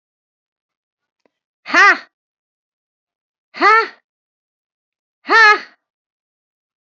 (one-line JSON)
{"exhalation_length": "6.8 s", "exhalation_amplitude": 28876, "exhalation_signal_mean_std_ratio": 0.27, "survey_phase": "beta (2021-08-13 to 2022-03-07)", "age": "65+", "gender": "Female", "wearing_mask": "No", "symptom_cough_any": true, "symptom_fatigue": true, "smoker_status": "Ex-smoker", "respiratory_condition_asthma": false, "respiratory_condition_other": false, "recruitment_source": "REACT", "submission_delay": "1 day", "covid_test_result": "Negative", "covid_test_method": "RT-qPCR"}